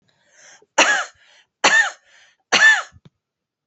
{
  "three_cough_length": "3.7 s",
  "three_cough_amplitude": 29971,
  "three_cough_signal_mean_std_ratio": 0.39,
  "survey_phase": "alpha (2021-03-01 to 2021-08-12)",
  "age": "45-64",
  "gender": "Female",
  "wearing_mask": "No",
  "symptom_change_to_sense_of_smell_or_taste": true,
  "symptom_loss_of_taste": true,
  "symptom_onset": "2 days",
  "smoker_status": "Ex-smoker",
  "respiratory_condition_asthma": false,
  "respiratory_condition_other": false,
  "recruitment_source": "Test and Trace",
  "submission_delay": "1 day",
  "covid_test_result": "Positive",
  "covid_test_method": "RT-qPCR",
  "covid_ct_value": 21.1,
  "covid_ct_gene": "ORF1ab gene",
  "covid_ct_mean": 21.5,
  "covid_viral_load": "89000 copies/ml",
  "covid_viral_load_category": "Low viral load (10K-1M copies/ml)"
}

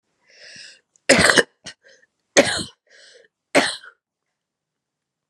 {
  "three_cough_length": "5.3 s",
  "three_cough_amplitude": 32768,
  "three_cough_signal_mean_std_ratio": 0.28,
  "survey_phase": "beta (2021-08-13 to 2022-03-07)",
  "age": "18-44",
  "gender": "Female",
  "wearing_mask": "No",
  "symptom_runny_or_blocked_nose": true,
  "symptom_fatigue": true,
  "symptom_headache": true,
  "symptom_onset": "3 days",
  "smoker_status": "Never smoked",
  "respiratory_condition_asthma": false,
  "respiratory_condition_other": false,
  "recruitment_source": "Test and Trace",
  "submission_delay": "1 day",
  "covid_test_result": "Positive",
  "covid_test_method": "ePCR"
}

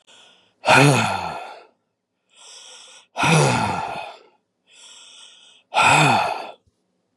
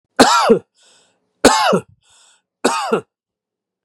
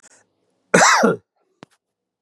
{
  "exhalation_length": "7.2 s",
  "exhalation_amplitude": 28906,
  "exhalation_signal_mean_std_ratio": 0.46,
  "three_cough_length": "3.8 s",
  "three_cough_amplitude": 32768,
  "three_cough_signal_mean_std_ratio": 0.41,
  "cough_length": "2.2 s",
  "cough_amplitude": 32768,
  "cough_signal_mean_std_ratio": 0.36,
  "survey_phase": "beta (2021-08-13 to 2022-03-07)",
  "age": "18-44",
  "gender": "Male",
  "wearing_mask": "No",
  "symptom_none": true,
  "smoker_status": "Never smoked",
  "respiratory_condition_asthma": false,
  "respiratory_condition_other": false,
  "recruitment_source": "REACT",
  "submission_delay": "3 days",
  "covid_test_result": "Negative",
  "covid_test_method": "RT-qPCR",
  "influenza_a_test_result": "Negative",
  "influenza_b_test_result": "Negative"
}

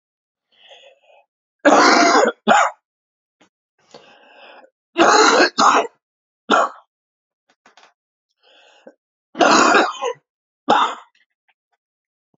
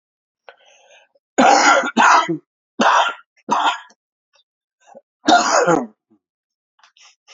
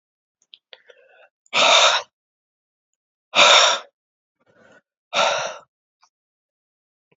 {
  "three_cough_length": "12.4 s",
  "three_cough_amplitude": 31182,
  "three_cough_signal_mean_std_ratio": 0.39,
  "cough_length": "7.3 s",
  "cough_amplitude": 31193,
  "cough_signal_mean_std_ratio": 0.44,
  "exhalation_length": "7.2 s",
  "exhalation_amplitude": 30568,
  "exhalation_signal_mean_std_ratio": 0.33,
  "survey_phase": "alpha (2021-03-01 to 2021-08-12)",
  "age": "65+",
  "gender": "Male",
  "wearing_mask": "No",
  "symptom_cough_any": true,
  "symptom_fatigue": true,
  "symptom_headache": true,
  "symptom_onset": "3 days",
  "smoker_status": "Ex-smoker",
  "respiratory_condition_asthma": false,
  "respiratory_condition_other": false,
  "recruitment_source": "Test and Trace",
  "submission_delay": "2 days",
  "covid_test_result": "Positive",
  "covid_test_method": "RT-qPCR",
  "covid_ct_value": 12.7,
  "covid_ct_gene": "ORF1ab gene",
  "covid_ct_mean": 13.1,
  "covid_viral_load": "51000000 copies/ml",
  "covid_viral_load_category": "High viral load (>1M copies/ml)"
}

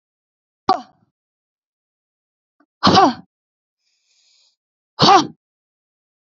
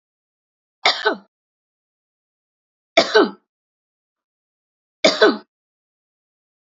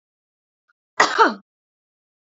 {
  "exhalation_length": "6.2 s",
  "exhalation_amplitude": 30521,
  "exhalation_signal_mean_std_ratio": 0.26,
  "three_cough_length": "6.7 s",
  "three_cough_amplitude": 30104,
  "three_cough_signal_mean_std_ratio": 0.25,
  "cough_length": "2.2 s",
  "cough_amplitude": 30609,
  "cough_signal_mean_std_ratio": 0.26,
  "survey_phase": "alpha (2021-03-01 to 2021-08-12)",
  "age": "18-44",
  "gender": "Female",
  "wearing_mask": "No",
  "symptom_none": true,
  "smoker_status": "Never smoked",
  "respiratory_condition_asthma": false,
  "respiratory_condition_other": false,
  "recruitment_source": "REACT",
  "submission_delay": "1 day",
  "covid_test_result": "Negative",
  "covid_test_method": "RT-qPCR"
}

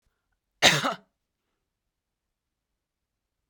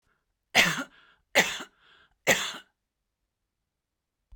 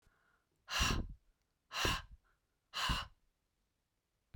{
  "cough_length": "3.5 s",
  "cough_amplitude": 30484,
  "cough_signal_mean_std_ratio": 0.2,
  "three_cough_length": "4.4 s",
  "three_cough_amplitude": 18573,
  "three_cough_signal_mean_std_ratio": 0.29,
  "exhalation_length": "4.4 s",
  "exhalation_amplitude": 3076,
  "exhalation_signal_mean_std_ratio": 0.39,
  "survey_phase": "beta (2021-08-13 to 2022-03-07)",
  "age": "45-64",
  "gender": "Female",
  "wearing_mask": "No",
  "symptom_none": true,
  "smoker_status": "Never smoked",
  "respiratory_condition_asthma": false,
  "respiratory_condition_other": false,
  "recruitment_source": "REACT",
  "submission_delay": "2 days",
  "covid_test_result": "Negative",
  "covid_test_method": "RT-qPCR"
}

